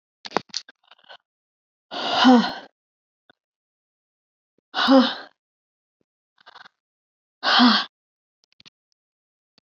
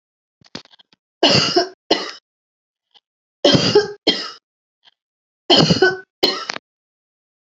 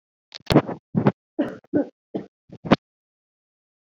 {"exhalation_length": "9.6 s", "exhalation_amplitude": 23126, "exhalation_signal_mean_std_ratio": 0.29, "three_cough_length": "7.6 s", "three_cough_amplitude": 32143, "three_cough_signal_mean_std_ratio": 0.37, "cough_length": "3.8 s", "cough_amplitude": 29421, "cough_signal_mean_std_ratio": 0.29, "survey_phase": "beta (2021-08-13 to 2022-03-07)", "age": "45-64", "gender": "Female", "wearing_mask": "No", "symptom_runny_or_blocked_nose": true, "symptom_sore_throat": true, "symptom_onset": "2 days", "smoker_status": "Ex-smoker", "respiratory_condition_asthma": false, "respiratory_condition_other": false, "recruitment_source": "REACT", "submission_delay": "1 day", "covid_test_result": "Negative", "covid_test_method": "RT-qPCR"}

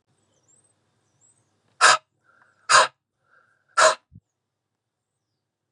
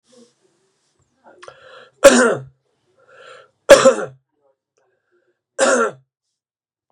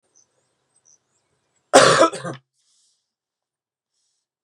{"exhalation_length": "5.7 s", "exhalation_amplitude": 31262, "exhalation_signal_mean_std_ratio": 0.23, "three_cough_length": "6.9 s", "three_cough_amplitude": 32768, "three_cough_signal_mean_std_ratio": 0.27, "cough_length": "4.4 s", "cough_amplitude": 32767, "cough_signal_mean_std_ratio": 0.23, "survey_phase": "beta (2021-08-13 to 2022-03-07)", "age": "45-64", "gender": "Male", "wearing_mask": "No", "symptom_cough_any": true, "symptom_shortness_of_breath": true, "symptom_sore_throat": true, "symptom_fatigue": true, "symptom_headache": true, "symptom_change_to_sense_of_smell_or_taste": true, "symptom_loss_of_taste": true, "symptom_onset": "3 days", "smoker_status": "Never smoked", "respiratory_condition_asthma": false, "respiratory_condition_other": false, "recruitment_source": "Test and Trace", "submission_delay": "1 day", "covid_test_result": "Positive", "covid_test_method": "RT-qPCR", "covid_ct_value": 23.6, "covid_ct_gene": "N gene"}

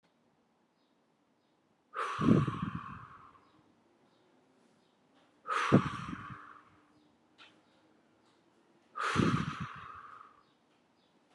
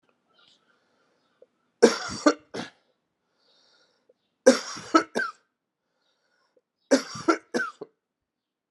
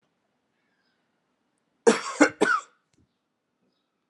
{"exhalation_length": "11.3 s", "exhalation_amplitude": 10091, "exhalation_signal_mean_std_ratio": 0.33, "three_cough_length": "8.7 s", "three_cough_amplitude": 25702, "three_cough_signal_mean_std_ratio": 0.24, "cough_length": "4.1 s", "cough_amplitude": 23252, "cough_signal_mean_std_ratio": 0.24, "survey_phase": "alpha (2021-03-01 to 2021-08-12)", "age": "45-64", "gender": "Male", "wearing_mask": "No", "symptom_fatigue": true, "symptom_onset": "4 days", "smoker_status": "Never smoked", "respiratory_condition_asthma": false, "respiratory_condition_other": false, "recruitment_source": "Test and Trace", "submission_delay": "2 days", "covid_test_result": "Positive", "covid_test_method": "RT-qPCR", "covid_ct_value": 16.4, "covid_ct_gene": "ORF1ab gene", "covid_ct_mean": 16.7, "covid_viral_load": "3400000 copies/ml", "covid_viral_load_category": "High viral load (>1M copies/ml)"}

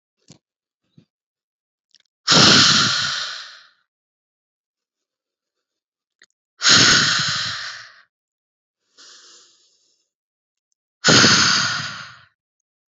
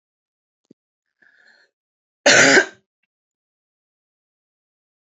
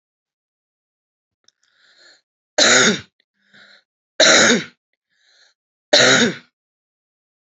{"exhalation_length": "12.9 s", "exhalation_amplitude": 31147, "exhalation_signal_mean_std_ratio": 0.37, "cough_length": "5.0 s", "cough_amplitude": 30295, "cough_signal_mean_std_ratio": 0.22, "three_cough_length": "7.4 s", "three_cough_amplitude": 32768, "three_cough_signal_mean_std_ratio": 0.33, "survey_phase": "beta (2021-08-13 to 2022-03-07)", "age": "18-44", "gender": "Female", "wearing_mask": "No", "symptom_none": true, "symptom_onset": "12 days", "smoker_status": "Current smoker (11 or more cigarettes per day)", "respiratory_condition_asthma": true, "respiratory_condition_other": false, "recruitment_source": "REACT", "submission_delay": "1 day", "covid_test_result": "Negative", "covid_test_method": "RT-qPCR"}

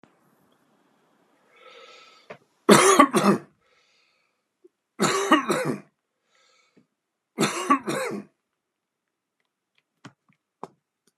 {"three_cough_length": "11.2 s", "three_cough_amplitude": 32767, "three_cough_signal_mean_std_ratio": 0.3, "survey_phase": "beta (2021-08-13 to 2022-03-07)", "age": "45-64", "gender": "Male", "wearing_mask": "No", "symptom_none": true, "smoker_status": "Current smoker (1 to 10 cigarettes per day)", "respiratory_condition_asthma": false, "respiratory_condition_other": false, "recruitment_source": "REACT", "submission_delay": "6 days", "covid_test_result": "Negative", "covid_test_method": "RT-qPCR"}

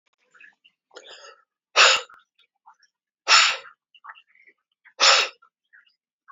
{"exhalation_length": "6.3 s", "exhalation_amplitude": 24889, "exhalation_signal_mean_std_ratio": 0.28, "survey_phase": "beta (2021-08-13 to 2022-03-07)", "age": "45-64", "gender": "Male", "wearing_mask": "No", "symptom_none": true, "smoker_status": "Never smoked", "respiratory_condition_asthma": true, "respiratory_condition_other": false, "recruitment_source": "REACT", "submission_delay": "1 day", "covid_test_result": "Negative", "covid_test_method": "RT-qPCR"}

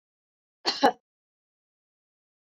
{"cough_length": "2.6 s", "cough_amplitude": 14810, "cough_signal_mean_std_ratio": 0.19, "survey_phase": "beta (2021-08-13 to 2022-03-07)", "age": "45-64", "gender": "Female", "wearing_mask": "No", "symptom_none": true, "smoker_status": "Never smoked", "respiratory_condition_asthma": false, "respiratory_condition_other": false, "recruitment_source": "REACT", "submission_delay": "1 day", "covid_test_result": "Negative", "covid_test_method": "RT-qPCR"}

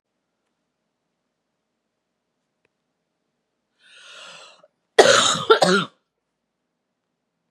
{"cough_length": "7.5 s", "cough_amplitude": 32767, "cough_signal_mean_std_ratio": 0.24, "survey_phase": "beta (2021-08-13 to 2022-03-07)", "age": "45-64", "gender": "Female", "wearing_mask": "No", "symptom_cough_any": true, "symptom_runny_or_blocked_nose": true, "symptom_shortness_of_breath": true, "symptom_sore_throat": true, "symptom_fatigue": true, "symptom_headache": true, "symptom_onset": "2 days", "smoker_status": "Never smoked", "respiratory_condition_asthma": false, "respiratory_condition_other": false, "recruitment_source": "Test and Trace", "submission_delay": "2 days", "covid_test_result": "Positive", "covid_test_method": "RT-qPCR", "covid_ct_value": 25.0, "covid_ct_gene": "N gene", "covid_ct_mean": 25.1, "covid_viral_load": "5800 copies/ml", "covid_viral_load_category": "Minimal viral load (< 10K copies/ml)"}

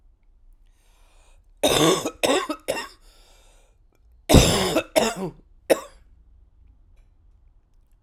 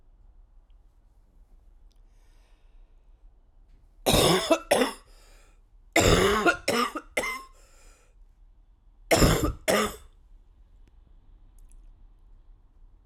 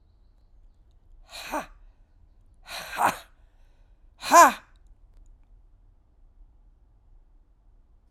{"cough_length": "8.0 s", "cough_amplitude": 32767, "cough_signal_mean_std_ratio": 0.36, "three_cough_length": "13.1 s", "three_cough_amplitude": 16806, "three_cough_signal_mean_std_ratio": 0.37, "exhalation_length": "8.1 s", "exhalation_amplitude": 25378, "exhalation_signal_mean_std_ratio": 0.21, "survey_phase": "alpha (2021-03-01 to 2021-08-12)", "age": "65+", "gender": "Female", "wearing_mask": "No", "symptom_cough_any": true, "symptom_shortness_of_breath": true, "symptom_fatigue": true, "symptom_change_to_sense_of_smell_or_taste": true, "symptom_onset": "3 days", "smoker_status": "Ex-smoker", "respiratory_condition_asthma": false, "respiratory_condition_other": false, "recruitment_source": "Test and Trace", "submission_delay": "1 day", "covid_test_result": "Positive", "covid_test_method": "RT-qPCR", "covid_ct_value": 22.9, "covid_ct_gene": "ORF1ab gene", "covid_ct_mean": 23.1, "covid_viral_load": "26000 copies/ml", "covid_viral_load_category": "Low viral load (10K-1M copies/ml)"}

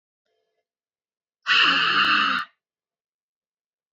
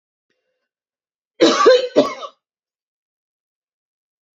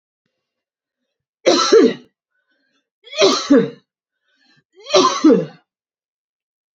{"exhalation_length": "3.9 s", "exhalation_amplitude": 16068, "exhalation_signal_mean_std_ratio": 0.42, "cough_length": "4.4 s", "cough_amplitude": 27658, "cough_signal_mean_std_ratio": 0.29, "three_cough_length": "6.7 s", "three_cough_amplitude": 28921, "three_cough_signal_mean_std_ratio": 0.37, "survey_phase": "beta (2021-08-13 to 2022-03-07)", "age": "65+", "gender": "Female", "wearing_mask": "No", "symptom_none": true, "smoker_status": "Ex-smoker", "respiratory_condition_asthma": false, "respiratory_condition_other": false, "recruitment_source": "REACT", "submission_delay": "1 day", "covid_test_result": "Negative", "covid_test_method": "RT-qPCR", "influenza_a_test_result": "Negative", "influenza_b_test_result": "Negative"}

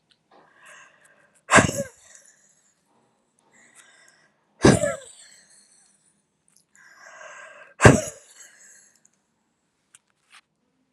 {"exhalation_length": "10.9 s", "exhalation_amplitude": 32768, "exhalation_signal_mean_std_ratio": 0.2, "survey_phase": "alpha (2021-03-01 to 2021-08-12)", "age": "45-64", "gender": "Female", "wearing_mask": "No", "symptom_shortness_of_breath": true, "symptom_diarrhoea": true, "symptom_fatigue": true, "symptom_loss_of_taste": true, "symptom_onset": "9 days", "smoker_status": "Never smoked", "respiratory_condition_asthma": false, "respiratory_condition_other": false, "recruitment_source": "REACT", "submission_delay": "2 days", "covid_test_result": "Negative", "covid_test_method": "RT-qPCR"}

